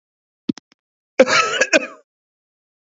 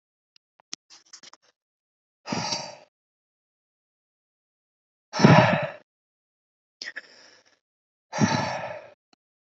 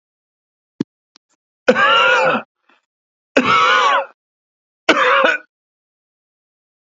{"cough_length": "2.8 s", "cough_amplitude": 29873, "cough_signal_mean_std_ratio": 0.32, "exhalation_length": "9.5 s", "exhalation_amplitude": 26085, "exhalation_signal_mean_std_ratio": 0.26, "three_cough_length": "6.9 s", "three_cough_amplitude": 32768, "three_cough_signal_mean_std_ratio": 0.44, "survey_phase": "beta (2021-08-13 to 2022-03-07)", "age": "45-64", "gender": "Male", "wearing_mask": "No", "symptom_abdominal_pain": true, "symptom_headache": true, "smoker_status": "Ex-smoker", "respiratory_condition_asthma": false, "respiratory_condition_other": false, "recruitment_source": "REACT", "submission_delay": "1 day", "covid_test_result": "Negative", "covid_test_method": "RT-qPCR", "influenza_a_test_result": "Negative", "influenza_b_test_result": "Negative"}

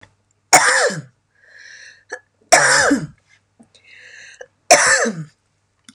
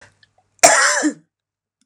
{"three_cough_length": "5.9 s", "three_cough_amplitude": 32768, "three_cough_signal_mean_std_ratio": 0.4, "cough_length": "1.9 s", "cough_amplitude": 32768, "cough_signal_mean_std_ratio": 0.39, "survey_phase": "beta (2021-08-13 to 2022-03-07)", "age": "45-64", "gender": "Female", "wearing_mask": "No", "symptom_none": true, "smoker_status": "Never smoked", "respiratory_condition_asthma": false, "respiratory_condition_other": false, "recruitment_source": "REACT", "submission_delay": "6 days", "covid_test_result": "Negative", "covid_test_method": "RT-qPCR", "influenza_a_test_result": "Negative", "influenza_b_test_result": "Negative"}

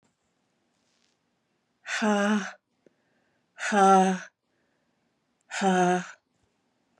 {"exhalation_length": "7.0 s", "exhalation_amplitude": 12930, "exhalation_signal_mean_std_ratio": 0.38, "survey_phase": "beta (2021-08-13 to 2022-03-07)", "age": "45-64", "gender": "Female", "wearing_mask": "No", "symptom_cough_any": true, "symptom_runny_or_blocked_nose": true, "symptom_sore_throat": true, "symptom_abdominal_pain": true, "symptom_diarrhoea": true, "symptom_fatigue": true, "symptom_fever_high_temperature": true, "symptom_headache": true, "symptom_change_to_sense_of_smell_or_taste": true, "smoker_status": "Never smoked", "respiratory_condition_asthma": false, "respiratory_condition_other": false, "recruitment_source": "Test and Trace", "submission_delay": "2 days", "covid_test_result": "Positive", "covid_test_method": "RT-qPCR", "covid_ct_value": 24.0, "covid_ct_gene": "ORF1ab gene"}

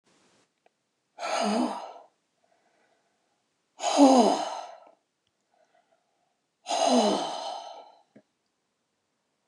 {"exhalation_length": "9.5 s", "exhalation_amplitude": 17360, "exhalation_signal_mean_std_ratio": 0.35, "survey_phase": "beta (2021-08-13 to 2022-03-07)", "age": "65+", "gender": "Female", "wearing_mask": "No", "symptom_none": true, "symptom_onset": "12 days", "smoker_status": "Ex-smoker", "respiratory_condition_asthma": false, "respiratory_condition_other": false, "recruitment_source": "REACT", "submission_delay": "1 day", "covid_test_result": "Negative", "covid_test_method": "RT-qPCR"}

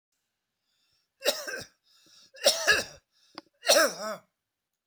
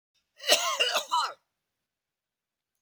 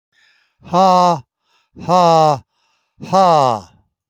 {"three_cough_length": "4.9 s", "three_cough_amplitude": 15434, "three_cough_signal_mean_std_ratio": 0.34, "cough_length": "2.8 s", "cough_amplitude": 18493, "cough_signal_mean_std_ratio": 0.4, "exhalation_length": "4.1 s", "exhalation_amplitude": 28599, "exhalation_signal_mean_std_ratio": 0.5, "survey_phase": "beta (2021-08-13 to 2022-03-07)", "age": "65+", "gender": "Male", "wearing_mask": "No", "symptom_none": true, "smoker_status": "Never smoked", "respiratory_condition_asthma": false, "respiratory_condition_other": false, "recruitment_source": "REACT", "submission_delay": "1 day", "covid_test_result": "Negative", "covid_test_method": "RT-qPCR"}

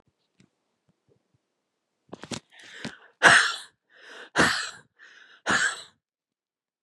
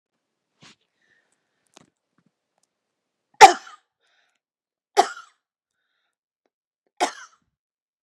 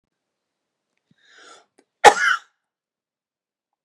{"exhalation_length": "6.8 s", "exhalation_amplitude": 25556, "exhalation_signal_mean_std_ratio": 0.29, "three_cough_length": "8.0 s", "three_cough_amplitude": 32768, "three_cough_signal_mean_std_ratio": 0.12, "cough_length": "3.8 s", "cough_amplitude": 32768, "cough_signal_mean_std_ratio": 0.18, "survey_phase": "beta (2021-08-13 to 2022-03-07)", "age": "45-64", "gender": "Female", "wearing_mask": "No", "symptom_cough_any": true, "symptom_shortness_of_breath": true, "symptom_sore_throat": true, "symptom_fatigue": true, "symptom_headache": true, "symptom_change_to_sense_of_smell_or_taste": true, "symptom_other": true, "smoker_status": "Never smoked", "respiratory_condition_asthma": false, "respiratory_condition_other": false, "recruitment_source": "Test and Trace", "submission_delay": "2 days", "covid_test_result": "Positive", "covid_test_method": "LFT"}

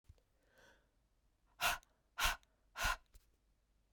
{"exhalation_length": "3.9 s", "exhalation_amplitude": 2993, "exhalation_signal_mean_std_ratio": 0.31, "survey_phase": "beta (2021-08-13 to 2022-03-07)", "age": "18-44", "gender": "Female", "wearing_mask": "No", "symptom_cough_any": true, "symptom_runny_or_blocked_nose": true, "symptom_change_to_sense_of_smell_or_taste": true, "symptom_loss_of_taste": true, "symptom_onset": "4 days", "smoker_status": "Ex-smoker", "respiratory_condition_asthma": false, "respiratory_condition_other": false, "recruitment_source": "Test and Trace", "submission_delay": "3 days", "covid_test_result": "Positive", "covid_test_method": "RT-qPCR", "covid_ct_value": 14.7, "covid_ct_gene": "ORF1ab gene", "covid_ct_mean": 15.7, "covid_viral_load": "7100000 copies/ml", "covid_viral_load_category": "High viral load (>1M copies/ml)"}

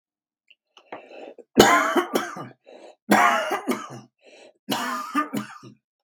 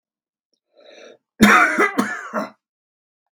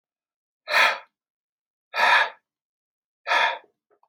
{"three_cough_length": "6.0 s", "three_cough_amplitude": 32767, "three_cough_signal_mean_std_ratio": 0.43, "cough_length": "3.3 s", "cough_amplitude": 32768, "cough_signal_mean_std_ratio": 0.37, "exhalation_length": "4.1 s", "exhalation_amplitude": 16383, "exhalation_signal_mean_std_ratio": 0.37, "survey_phase": "beta (2021-08-13 to 2022-03-07)", "age": "65+", "gender": "Male", "wearing_mask": "No", "symptom_none": true, "smoker_status": "Ex-smoker", "respiratory_condition_asthma": false, "respiratory_condition_other": false, "recruitment_source": "REACT", "submission_delay": "2 days", "covid_test_result": "Negative", "covid_test_method": "RT-qPCR", "influenza_a_test_result": "Negative", "influenza_b_test_result": "Negative"}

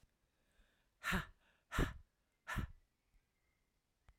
{"exhalation_length": "4.2 s", "exhalation_amplitude": 2126, "exhalation_signal_mean_std_ratio": 0.3, "survey_phase": "alpha (2021-03-01 to 2021-08-12)", "age": "45-64", "gender": "Female", "wearing_mask": "No", "symptom_headache": true, "symptom_onset": "6 days", "smoker_status": "Never smoked", "respiratory_condition_asthma": false, "respiratory_condition_other": false, "recruitment_source": "REACT", "submission_delay": "1 day", "covid_test_result": "Negative", "covid_test_method": "RT-qPCR"}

